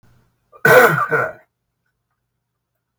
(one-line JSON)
{"cough_length": "3.0 s", "cough_amplitude": 32768, "cough_signal_mean_std_ratio": 0.34, "survey_phase": "beta (2021-08-13 to 2022-03-07)", "age": "65+", "gender": "Male", "wearing_mask": "No", "symptom_none": true, "smoker_status": "Never smoked", "respiratory_condition_asthma": false, "respiratory_condition_other": false, "recruitment_source": "REACT", "submission_delay": "6 days", "covid_test_result": "Negative", "covid_test_method": "RT-qPCR", "influenza_a_test_result": "Negative", "influenza_b_test_result": "Negative"}